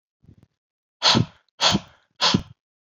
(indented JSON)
{
  "exhalation_length": "2.8 s",
  "exhalation_amplitude": 20331,
  "exhalation_signal_mean_std_ratio": 0.37,
  "survey_phase": "beta (2021-08-13 to 2022-03-07)",
  "age": "45-64",
  "gender": "Male",
  "wearing_mask": "No",
  "symptom_none": true,
  "smoker_status": "Never smoked",
  "respiratory_condition_asthma": false,
  "respiratory_condition_other": false,
  "recruitment_source": "REACT",
  "submission_delay": "4 days",
  "covid_test_result": "Negative",
  "covid_test_method": "RT-qPCR"
}